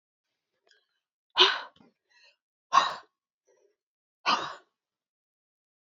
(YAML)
exhalation_length: 5.8 s
exhalation_amplitude: 18054
exhalation_signal_mean_std_ratio: 0.23
survey_phase: beta (2021-08-13 to 2022-03-07)
age: 18-44
gender: Female
wearing_mask: 'No'
symptom_fatigue: true
symptom_headache: true
symptom_onset: 12 days
smoker_status: Ex-smoker
respiratory_condition_asthma: false
respiratory_condition_other: false
recruitment_source: REACT
submission_delay: 1 day
covid_test_result: Negative
covid_test_method: RT-qPCR
influenza_a_test_result: Negative
influenza_b_test_result: Negative